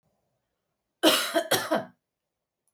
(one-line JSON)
{"cough_length": "2.7 s", "cough_amplitude": 20869, "cough_signal_mean_std_ratio": 0.37, "survey_phase": "beta (2021-08-13 to 2022-03-07)", "age": "45-64", "gender": "Female", "wearing_mask": "No", "symptom_none": true, "smoker_status": "Never smoked", "respiratory_condition_asthma": false, "respiratory_condition_other": false, "recruitment_source": "REACT", "submission_delay": "6 days", "covid_test_result": "Negative", "covid_test_method": "RT-qPCR"}